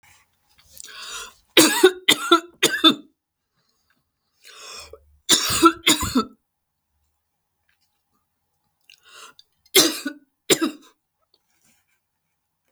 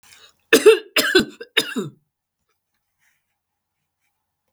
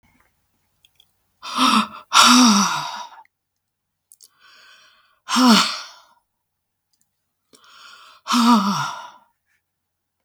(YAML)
three_cough_length: 12.7 s
three_cough_amplitude: 32768
three_cough_signal_mean_std_ratio: 0.29
cough_length: 4.5 s
cough_amplitude: 32768
cough_signal_mean_std_ratio: 0.28
exhalation_length: 10.2 s
exhalation_amplitude: 32768
exhalation_signal_mean_std_ratio: 0.38
survey_phase: beta (2021-08-13 to 2022-03-07)
age: 65+
gender: Female
wearing_mask: 'No'
symptom_cough_any: true
smoker_status: Never smoked
respiratory_condition_asthma: false
respiratory_condition_other: false
recruitment_source: REACT
submission_delay: 1 day
covid_test_result: Negative
covid_test_method: RT-qPCR
influenza_a_test_result: Unknown/Void
influenza_b_test_result: Unknown/Void